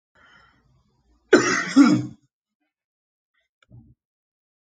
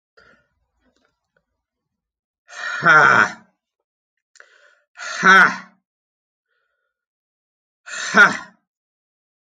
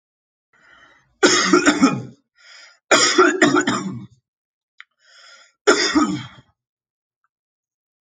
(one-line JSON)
{"cough_length": "4.6 s", "cough_amplitude": 27164, "cough_signal_mean_std_ratio": 0.28, "exhalation_length": "9.6 s", "exhalation_amplitude": 31277, "exhalation_signal_mean_std_ratio": 0.28, "three_cough_length": "8.0 s", "three_cough_amplitude": 30466, "three_cough_signal_mean_std_ratio": 0.42, "survey_phase": "alpha (2021-03-01 to 2021-08-12)", "age": "18-44", "gender": "Male", "wearing_mask": "No", "symptom_cough_any": true, "smoker_status": "Never smoked", "respiratory_condition_asthma": false, "respiratory_condition_other": false, "recruitment_source": "Test and Trace", "submission_delay": "3 days", "covid_test_result": "Positive", "covid_test_method": "LFT"}